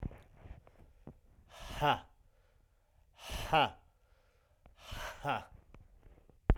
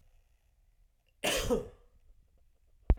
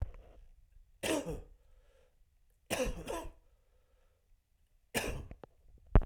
exhalation_length: 6.6 s
exhalation_amplitude: 8146
exhalation_signal_mean_std_ratio: 0.33
cough_length: 3.0 s
cough_amplitude: 8970
cough_signal_mean_std_ratio: 0.3
three_cough_length: 6.1 s
three_cough_amplitude: 12034
three_cough_signal_mean_std_ratio: 0.31
survey_phase: beta (2021-08-13 to 2022-03-07)
age: 18-44
gender: Male
wearing_mask: 'No'
symptom_runny_or_blocked_nose: true
symptom_sore_throat: true
symptom_fatigue: true
symptom_fever_high_temperature: true
symptom_headache: true
symptom_onset: 3 days
smoker_status: Never smoked
respiratory_condition_asthma: false
respiratory_condition_other: false
recruitment_source: Test and Trace
submission_delay: 2 days
covid_test_result: Positive
covid_test_method: RT-qPCR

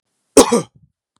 cough_length: 1.2 s
cough_amplitude: 32768
cough_signal_mean_std_ratio: 0.31
survey_phase: beta (2021-08-13 to 2022-03-07)
age: 45-64
gender: Male
wearing_mask: 'No'
symptom_none: true
smoker_status: Never smoked
respiratory_condition_asthma: false
respiratory_condition_other: false
recruitment_source: REACT
submission_delay: 0 days
covid_test_result: Negative
covid_test_method: RT-qPCR
influenza_a_test_result: Negative
influenza_b_test_result: Negative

